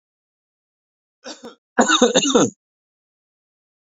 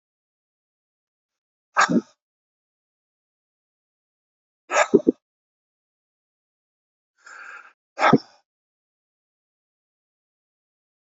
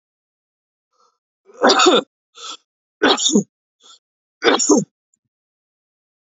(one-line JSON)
{"cough_length": "3.8 s", "cough_amplitude": 28434, "cough_signal_mean_std_ratio": 0.32, "exhalation_length": "11.2 s", "exhalation_amplitude": 31454, "exhalation_signal_mean_std_ratio": 0.18, "three_cough_length": "6.4 s", "three_cough_amplitude": 30227, "three_cough_signal_mean_std_ratio": 0.34, "survey_phase": "beta (2021-08-13 to 2022-03-07)", "age": "45-64", "gender": "Male", "wearing_mask": "No", "symptom_none": true, "smoker_status": "Current smoker (1 to 10 cigarettes per day)", "respiratory_condition_asthma": false, "respiratory_condition_other": false, "recruitment_source": "REACT", "submission_delay": "1 day", "covid_test_result": "Negative", "covid_test_method": "RT-qPCR", "influenza_a_test_result": "Unknown/Void", "influenza_b_test_result": "Unknown/Void"}